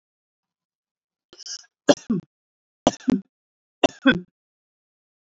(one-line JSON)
{"three_cough_length": "5.4 s", "three_cough_amplitude": 27881, "three_cough_signal_mean_std_ratio": 0.21, "survey_phase": "beta (2021-08-13 to 2022-03-07)", "age": "45-64", "gender": "Female", "wearing_mask": "No", "symptom_none": true, "smoker_status": "Ex-smoker", "respiratory_condition_asthma": false, "respiratory_condition_other": false, "recruitment_source": "REACT", "submission_delay": "2 days", "covid_test_result": "Negative", "covid_test_method": "RT-qPCR", "influenza_a_test_result": "Negative", "influenza_b_test_result": "Negative"}